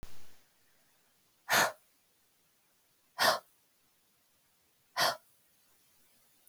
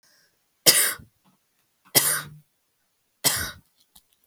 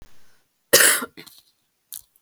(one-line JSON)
{"exhalation_length": "6.5 s", "exhalation_amplitude": 6727, "exhalation_signal_mean_std_ratio": 0.29, "three_cough_length": "4.3 s", "three_cough_amplitude": 32766, "three_cough_signal_mean_std_ratio": 0.31, "cough_length": "2.2 s", "cough_amplitude": 32767, "cough_signal_mean_std_ratio": 0.3, "survey_phase": "beta (2021-08-13 to 2022-03-07)", "age": "18-44", "gender": "Female", "wearing_mask": "No", "symptom_sore_throat": true, "symptom_fatigue": true, "symptom_onset": "3 days", "smoker_status": "Never smoked", "respiratory_condition_asthma": false, "respiratory_condition_other": false, "recruitment_source": "Test and Trace", "submission_delay": "1 day", "covid_test_result": "Positive", "covid_test_method": "RT-qPCR", "covid_ct_value": 25.6, "covid_ct_gene": "N gene"}